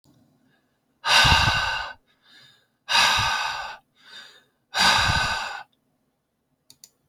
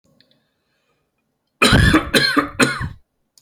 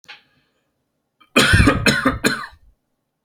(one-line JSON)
{"exhalation_length": "7.1 s", "exhalation_amplitude": 19809, "exhalation_signal_mean_std_ratio": 0.47, "three_cough_length": "3.4 s", "three_cough_amplitude": 32768, "three_cough_signal_mean_std_ratio": 0.44, "cough_length": "3.2 s", "cough_amplitude": 30685, "cough_signal_mean_std_ratio": 0.43, "survey_phase": "alpha (2021-03-01 to 2021-08-12)", "age": "18-44", "gender": "Male", "wearing_mask": "No", "symptom_none": true, "smoker_status": "Never smoked", "respiratory_condition_asthma": false, "respiratory_condition_other": false, "recruitment_source": "REACT", "submission_delay": "5 days", "covid_test_result": "Negative", "covid_test_method": "RT-qPCR"}